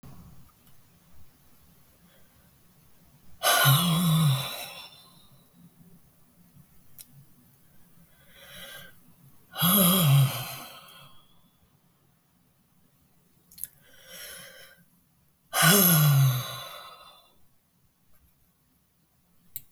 exhalation_length: 19.7 s
exhalation_amplitude: 14541
exhalation_signal_mean_std_ratio: 0.37
survey_phase: beta (2021-08-13 to 2022-03-07)
age: 45-64
gender: Female
wearing_mask: 'No'
symptom_none: true
smoker_status: Ex-smoker
respiratory_condition_asthma: false
respiratory_condition_other: false
recruitment_source: REACT
submission_delay: 1 day
covid_test_result: Negative
covid_test_method: RT-qPCR
influenza_a_test_result: Negative
influenza_b_test_result: Negative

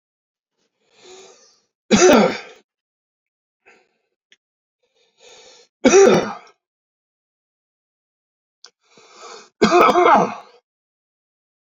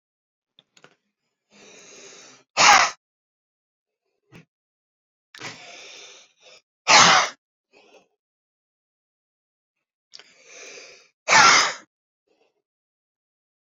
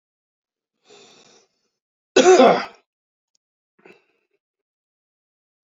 three_cough_length: 11.8 s
three_cough_amplitude: 30368
three_cough_signal_mean_std_ratio: 0.3
exhalation_length: 13.7 s
exhalation_amplitude: 30622
exhalation_signal_mean_std_ratio: 0.24
cough_length: 5.6 s
cough_amplitude: 30836
cough_signal_mean_std_ratio: 0.23
survey_phase: beta (2021-08-13 to 2022-03-07)
age: 65+
gender: Male
wearing_mask: 'No'
symptom_none: true
smoker_status: Ex-smoker
respiratory_condition_asthma: true
respiratory_condition_other: false
recruitment_source: REACT
submission_delay: 2 days
covid_test_result: Negative
covid_test_method: RT-qPCR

